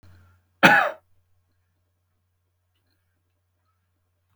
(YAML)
cough_length: 4.4 s
cough_amplitude: 32740
cough_signal_mean_std_ratio: 0.19
survey_phase: beta (2021-08-13 to 2022-03-07)
age: 65+
gender: Male
wearing_mask: 'No'
symptom_none: true
smoker_status: Ex-smoker
respiratory_condition_asthma: false
respiratory_condition_other: true
recruitment_source: REACT
submission_delay: 4 days
covid_test_result: Negative
covid_test_method: RT-qPCR